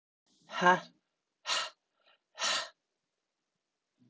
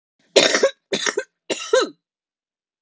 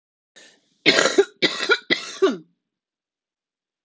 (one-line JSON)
{"exhalation_length": "4.1 s", "exhalation_amplitude": 10222, "exhalation_signal_mean_std_ratio": 0.29, "three_cough_length": "2.8 s", "three_cough_amplitude": 29884, "three_cough_signal_mean_std_ratio": 0.4, "cough_length": "3.8 s", "cough_amplitude": 29660, "cough_signal_mean_std_ratio": 0.36, "survey_phase": "alpha (2021-03-01 to 2021-08-12)", "age": "18-44", "gender": "Female", "wearing_mask": "No", "symptom_cough_any": true, "symptom_shortness_of_breath": true, "symptom_fatigue": true, "symptom_fever_high_temperature": true, "symptom_headache": true, "symptom_onset": "2 days", "smoker_status": "Current smoker (e-cigarettes or vapes only)", "respiratory_condition_asthma": false, "respiratory_condition_other": false, "recruitment_source": "Test and Trace", "submission_delay": "1 day", "covid_test_result": "Positive", "covid_test_method": "RT-qPCR", "covid_ct_value": 16.2, "covid_ct_gene": "ORF1ab gene", "covid_ct_mean": 17.3, "covid_viral_load": "2100000 copies/ml", "covid_viral_load_category": "High viral load (>1M copies/ml)"}